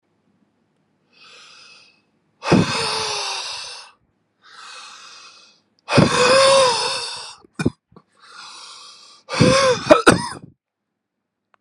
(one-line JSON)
{"exhalation_length": "11.6 s", "exhalation_amplitude": 32768, "exhalation_signal_mean_std_ratio": 0.41, "survey_phase": "beta (2021-08-13 to 2022-03-07)", "age": "18-44", "gender": "Male", "wearing_mask": "No", "symptom_cough_any": true, "symptom_runny_or_blocked_nose": true, "symptom_fatigue": true, "symptom_other": true, "symptom_onset": "6 days", "smoker_status": "Never smoked", "respiratory_condition_asthma": false, "respiratory_condition_other": false, "recruitment_source": "Test and Trace", "submission_delay": "1 day", "covid_test_result": "Positive", "covid_test_method": "RT-qPCR", "covid_ct_value": 20.3, "covid_ct_gene": "N gene"}